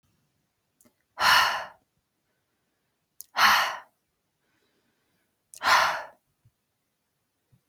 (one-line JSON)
{"exhalation_length": "7.7 s", "exhalation_amplitude": 16323, "exhalation_signal_mean_std_ratio": 0.31, "survey_phase": "beta (2021-08-13 to 2022-03-07)", "age": "18-44", "gender": "Female", "wearing_mask": "No", "symptom_runny_or_blocked_nose": true, "symptom_fatigue": true, "symptom_onset": "10 days", "smoker_status": "Never smoked", "respiratory_condition_asthma": false, "respiratory_condition_other": false, "recruitment_source": "REACT", "submission_delay": "1 day", "covid_test_result": "Negative", "covid_test_method": "RT-qPCR"}